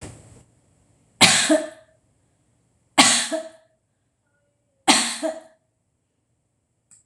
{
  "three_cough_length": "7.1 s",
  "three_cough_amplitude": 26028,
  "three_cough_signal_mean_std_ratio": 0.31,
  "survey_phase": "beta (2021-08-13 to 2022-03-07)",
  "age": "45-64",
  "gender": "Female",
  "wearing_mask": "No",
  "symptom_none": true,
  "smoker_status": "Ex-smoker",
  "respiratory_condition_asthma": false,
  "respiratory_condition_other": false,
  "recruitment_source": "REACT",
  "submission_delay": "2 days",
  "covid_test_result": "Negative",
  "covid_test_method": "RT-qPCR",
  "influenza_a_test_result": "Negative",
  "influenza_b_test_result": "Negative"
}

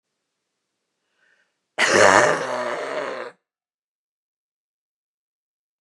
{
  "cough_length": "5.8 s",
  "cough_amplitude": 32767,
  "cough_signal_mean_std_ratio": 0.32,
  "survey_phase": "beta (2021-08-13 to 2022-03-07)",
  "age": "65+",
  "gender": "Female",
  "wearing_mask": "Yes",
  "symptom_new_continuous_cough": true,
  "symptom_shortness_of_breath": true,
  "symptom_abdominal_pain": true,
  "symptom_headache": true,
  "symptom_change_to_sense_of_smell_or_taste": true,
  "symptom_onset": "5 days",
  "smoker_status": "Never smoked",
  "respiratory_condition_asthma": false,
  "respiratory_condition_other": false,
  "recruitment_source": "Test and Trace",
  "submission_delay": "2 days",
  "covid_test_result": "Positive",
  "covid_test_method": "RT-qPCR",
  "covid_ct_value": 19.8,
  "covid_ct_gene": "ORF1ab gene"
}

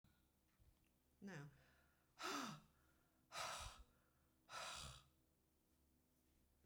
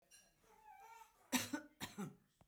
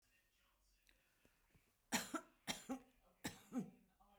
{
  "exhalation_length": "6.7 s",
  "exhalation_amplitude": 498,
  "exhalation_signal_mean_std_ratio": 0.46,
  "cough_length": "2.5 s",
  "cough_amplitude": 2865,
  "cough_signal_mean_std_ratio": 0.38,
  "three_cough_length": "4.2 s",
  "three_cough_amplitude": 1903,
  "three_cough_signal_mean_std_ratio": 0.34,
  "survey_phase": "beta (2021-08-13 to 2022-03-07)",
  "age": "65+",
  "gender": "Female",
  "wearing_mask": "No",
  "symptom_none": true,
  "smoker_status": "Ex-smoker",
  "respiratory_condition_asthma": false,
  "respiratory_condition_other": false,
  "recruitment_source": "REACT",
  "submission_delay": "2 days",
  "covid_test_result": "Negative",
  "covid_test_method": "RT-qPCR"
}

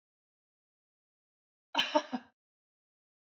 {
  "cough_length": "3.3 s",
  "cough_amplitude": 7034,
  "cough_signal_mean_std_ratio": 0.21,
  "survey_phase": "beta (2021-08-13 to 2022-03-07)",
  "age": "45-64",
  "gender": "Female",
  "wearing_mask": "No",
  "symptom_none": true,
  "smoker_status": "Never smoked",
  "respiratory_condition_asthma": false,
  "respiratory_condition_other": false,
  "recruitment_source": "Test and Trace",
  "submission_delay": "0 days",
  "covid_test_result": "Negative",
  "covid_test_method": "LFT"
}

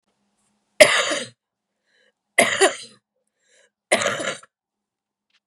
{
  "three_cough_length": "5.5 s",
  "three_cough_amplitude": 32768,
  "three_cough_signal_mean_std_ratio": 0.3,
  "survey_phase": "beta (2021-08-13 to 2022-03-07)",
  "age": "45-64",
  "gender": "Female",
  "wearing_mask": "No",
  "symptom_cough_any": true,
  "symptom_sore_throat": true,
  "symptom_onset": "5 days",
  "smoker_status": "Never smoked",
  "respiratory_condition_asthma": true,
  "respiratory_condition_other": false,
  "recruitment_source": "Test and Trace",
  "submission_delay": "3 days",
  "covid_test_result": "Negative",
  "covid_test_method": "RT-qPCR"
}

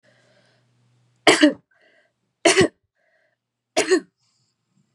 {
  "three_cough_length": "4.9 s",
  "three_cough_amplitude": 30453,
  "three_cough_signal_mean_std_ratio": 0.28,
  "survey_phase": "beta (2021-08-13 to 2022-03-07)",
  "age": "18-44",
  "gender": "Female",
  "wearing_mask": "No",
  "symptom_none": true,
  "smoker_status": "Never smoked",
  "respiratory_condition_asthma": false,
  "respiratory_condition_other": false,
  "recruitment_source": "REACT",
  "submission_delay": "2 days",
  "covid_test_result": "Negative",
  "covid_test_method": "RT-qPCR",
  "influenza_a_test_result": "Negative",
  "influenza_b_test_result": "Negative"
}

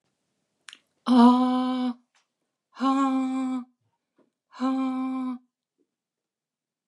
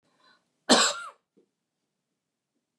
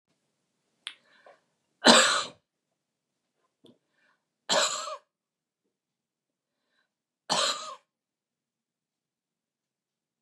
{
  "exhalation_length": "6.9 s",
  "exhalation_amplitude": 16195,
  "exhalation_signal_mean_std_ratio": 0.46,
  "cough_length": "2.8 s",
  "cough_amplitude": 18327,
  "cough_signal_mean_std_ratio": 0.24,
  "three_cough_length": "10.2 s",
  "three_cough_amplitude": 24815,
  "three_cough_signal_mean_std_ratio": 0.23,
  "survey_phase": "beta (2021-08-13 to 2022-03-07)",
  "age": "45-64",
  "gender": "Female",
  "wearing_mask": "No",
  "symptom_cough_any": true,
  "smoker_status": "Never smoked",
  "respiratory_condition_asthma": false,
  "respiratory_condition_other": false,
  "recruitment_source": "REACT",
  "submission_delay": "1 day",
  "covid_test_result": "Negative",
  "covid_test_method": "RT-qPCR",
  "influenza_a_test_result": "Negative",
  "influenza_b_test_result": "Negative"
}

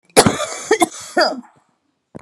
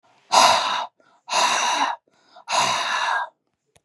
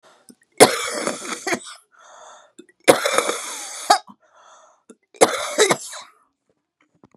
{
  "cough_length": "2.2 s",
  "cough_amplitude": 32768,
  "cough_signal_mean_std_ratio": 0.42,
  "exhalation_length": "3.8 s",
  "exhalation_amplitude": 31409,
  "exhalation_signal_mean_std_ratio": 0.6,
  "three_cough_length": "7.2 s",
  "three_cough_amplitude": 32768,
  "three_cough_signal_mean_std_ratio": 0.34,
  "survey_phase": "beta (2021-08-13 to 2022-03-07)",
  "age": "45-64",
  "gender": "Female",
  "wearing_mask": "No",
  "symptom_cough_any": true,
  "symptom_onset": "3 days",
  "smoker_status": "Ex-smoker",
  "respiratory_condition_asthma": false,
  "respiratory_condition_other": false,
  "recruitment_source": "REACT",
  "submission_delay": "2 days",
  "covid_test_result": "Negative",
  "covid_test_method": "RT-qPCR",
  "influenza_a_test_result": "Negative",
  "influenza_b_test_result": "Negative"
}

